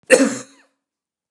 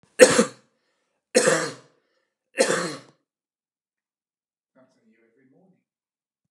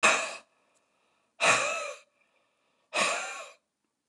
cough_length: 1.3 s
cough_amplitude: 29204
cough_signal_mean_std_ratio: 0.32
three_cough_length: 6.5 s
three_cough_amplitude: 29204
three_cough_signal_mean_std_ratio: 0.25
exhalation_length: 4.1 s
exhalation_amplitude: 12968
exhalation_signal_mean_std_ratio: 0.41
survey_phase: beta (2021-08-13 to 2022-03-07)
age: 45-64
gender: Male
wearing_mask: 'No'
symptom_none: true
smoker_status: Never smoked
respiratory_condition_asthma: false
respiratory_condition_other: false
recruitment_source: REACT
submission_delay: 2 days
covid_test_result: Negative
covid_test_method: RT-qPCR
influenza_a_test_result: Negative
influenza_b_test_result: Negative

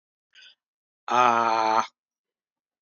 exhalation_length: 2.8 s
exhalation_amplitude: 19214
exhalation_signal_mean_std_ratio: 0.38
survey_phase: alpha (2021-03-01 to 2021-08-12)
age: 45-64
gender: Male
wearing_mask: 'No'
symptom_cough_any: true
symptom_onset: 5 days
smoker_status: Never smoked
respiratory_condition_asthma: false
respiratory_condition_other: false
recruitment_source: Test and Trace
submission_delay: 1 day
covid_test_result: Positive
covid_test_method: RT-qPCR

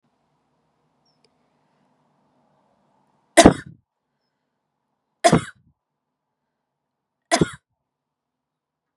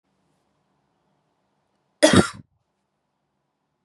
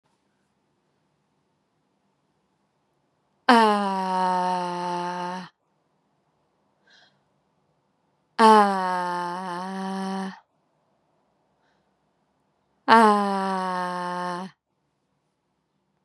three_cough_length: 9.0 s
three_cough_amplitude: 32768
three_cough_signal_mean_std_ratio: 0.16
cough_length: 3.8 s
cough_amplitude: 30031
cough_signal_mean_std_ratio: 0.19
exhalation_length: 16.0 s
exhalation_amplitude: 31323
exhalation_signal_mean_std_ratio: 0.35
survey_phase: beta (2021-08-13 to 2022-03-07)
age: 45-64
gender: Female
wearing_mask: 'No'
symptom_runny_or_blocked_nose: true
symptom_sore_throat: true
symptom_fatigue: true
symptom_headache: true
symptom_onset: 4 days
smoker_status: Never smoked
respiratory_condition_asthma: false
respiratory_condition_other: false
recruitment_source: Test and Trace
submission_delay: 1 day
covid_test_result: Positive
covid_test_method: RT-qPCR
covid_ct_value: 21.2
covid_ct_gene: ORF1ab gene
covid_ct_mean: 21.4
covid_viral_load: 93000 copies/ml
covid_viral_load_category: Low viral load (10K-1M copies/ml)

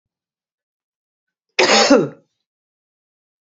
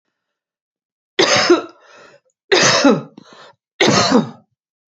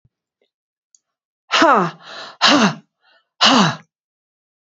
cough_length: 3.4 s
cough_amplitude: 29275
cough_signal_mean_std_ratio: 0.3
three_cough_length: 4.9 s
three_cough_amplitude: 30099
three_cough_signal_mean_std_ratio: 0.44
exhalation_length: 4.6 s
exhalation_amplitude: 31450
exhalation_signal_mean_std_ratio: 0.39
survey_phase: beta (2021-08-13 to 2022-03-07)
age: 65+
gender: Female
wearing_mask: 'No'
symptom_none: true
smoker_status: Never smoked
respiratory_condition_asthma: false
respiratory_condition_other: true
recruitment_source: REACT
submission_delay: 0 days
covid_test_result: Negative
covid_test_method: RT-qPCR
influenza_a_test_result: Negative
influenza_b_test_result: Negative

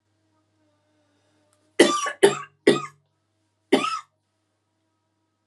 cough_length: 5.5 s
cough_amplitude: 32689
cough_signal_mean_std_ratio: 0.27
survey_phase: alpha (2021-03-01 to 2021-08-12)
age: 45-64
gender: Female
wearing_mask: 'No'
symptom_cough_any: true
symptom_new_continuous_cough: true
symptom_shortness_of_breath: true
symptom_fatigue: true
symptom_fever_high_temperature: true
symptom_headache: true
symptom_onset: 3 days
smoker_status: Current smoker (e-cigarettes or vapes only)
respiratory_condition_asthma: false
respiratory_condition_other: false
recruitment_source: Test and Trace
submission_delay: 2 days
covid_test_result: Positive
covid_test_method: RT-qPCR
covid_ct_value: 23.7
covid_ct_gene: ORF1ab gene
covid_ct_mean: 24.0
covid_viral_load: 14000 copies/ml
covid_viral_load_category: Low viral load (10K-1M copies/ml)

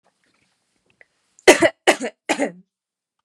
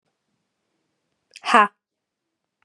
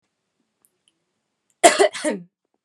three_cough_length: 3.2 s
three_cough_amplitude: 32768
three_cough_signal_mean_std_ratio: 0.26
exhalation_length: 2.6 s
exhalation_amplitude: 31541
exhalation_signal_mean_std_ratio: 0.2
cough_length: 2.6 s
cough_amplitude: 32768
cough_signal_mean_std_ratio: 0.26
survey_phase: beta (2021-08-13 to 2022-03-07)
age: 18-44
gender: Female
wearing_mask: 'No'
symptom_none: true
smoker_status: Never smoked
respiratory_condition_asthma: false
respiratory_condition_other: false
recruitment_source: REACT
submission_delay: 1 day
covid_test_result: Negative
covid_test_method: RT-qPCR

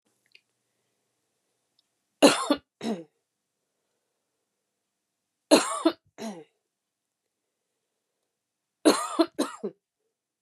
three_cough_length: 10.4 s
three_cough_amplitude: 24191
three_cough_signal_mean_std_ratio: 0.23
survey_phase: beta (2021-08-13 to 2022-03-07)
age: 18-44
gender: Female
wearing_mask: 'No'
symptom_cough_any: true
symptom_runny_or_blocked_nose: true
symptom_sore_throat: true
symptom_diarrhoea: true
symptom_fatigue: true
symptom_change_to_sense_of_smell_or_taste: true
symptom_loss_of_taste: true
smoker_status: Ex-smoker
respiratory_condition_asthma: false
respiratory_condition_other: false
recruitment_source: Test and Trace
submission_delay: 2 days
covid_test_result: Positive
covid_test_method: ePCR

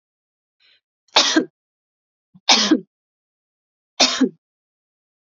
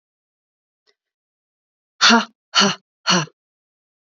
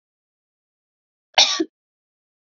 three_cough_length: 5.2 s
three_cough_amplitude: 32768
three_cough_signal_mean_std_ratio: 0.3
exhalation_length: 4.0 s
exhalation_amplitude: 31448
exhalation_signal_mean_std_ratio: 0.3
cough_length: 2.5 s
cough_amplitude: 32768
cough_signal_mean_std_ratio: 0.22
survey_phase: beta (2021-08-13 to 2022-03-07)
age: 18-44
gender: Female
wearing_mask: 'No'
symptom_diarrhoea: true
symptom_other: true
smoker_status: Never smoked
respiratory_condition_asthma: false
respiratory_condition_other: false
recruitment_source: Test and Trace
submission_delay: 1 day
covid_test_result: Positive
covid_test_method: ePCR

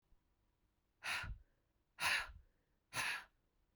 exhalation_length: 3.8 s
exhalation_amplitude: 1874
exhalation_signal_mean_std_ratio: 0.4
survey_phase: beta (2021-08-13 to 2022-03-07)
age: 45-64
gender: Female
wearing_mask: 'No'
symptom_cough_any: true
symptom_new_continuous_cough: true
symptom_runny_or_blocked_nose: true
symptom_shortness_of_breath: true
symptom_sore_throat: true
symptom_fatigue: true
symptom_fever_high_temperature: true
symptom_headache: true
symptom_change_to_sense_of_smell_or_taste: true
symptom_onset: 3 days
smoker_status: Ex-smoker
respiratory_condition_asthma: true
respiratory_condition_other: false
recruitment_source: Test and Trace
submission_delay: 2 days
covid_test_result: Positive
covid_test_method: RT-qPCR
covid_ct_value: 21.2
covid_ct_gene: ORF1ab gene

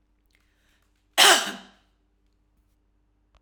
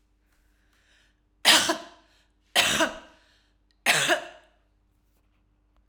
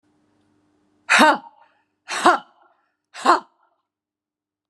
cough_length: 3.4 s
cough_amplitude: 28576
cough_signal_mean_std_ratio: 0.23
three_cough_length: 5.9 s
three_cough_amplitude: 19423
three_cough_signal_mean_std_ratio: 0.33
exhalation_length: 4.7 s
exhalation_amplitude: 32566
exhalation_signal_mean_std_ratio: 0.28
survey_phase: alpha (2021-03-01 to 2021-08-12)
age: 45-64
gender: Female
wearing_mask: 'No'
symptom_none: true
smoker_status: Never smoked
respiratory_condition_asthma: true
respiratory_condition_other: false
recruitment_source: REACT
submission_delay: 1 day
covid_test_result: Negative
covid_test_method: RT-qPCR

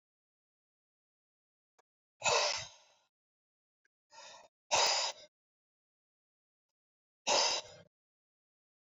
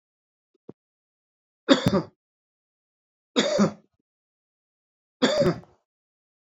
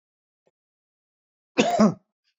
exhalation_length: 9.0 s
exhalation_amplitude: 4961
exhalation_signal_mean_std_ratio: 0.29
three_cough_length: 6.5 s
three_cough_amplitude: 25951
three_cough_signal_mean_std_ratio: 0.3
cough_length: 2.4 s
cough_amplitude: 20143
cough_signal_mean_std_ratio: 0.29
survey_phase: beta (2021-08-13 to 2022-03-07)
age: 45-64
gender: Male
wearing_mask: 'No'
symptom_none: true
smoker_status: Ex-smoker
respiratory_condition_asthma: false
respiratory_condition_other: false
recruitment_source: REACT
submission_delay: 1 day
covid_test_result: Negative
covid_test_method: RT-qPCR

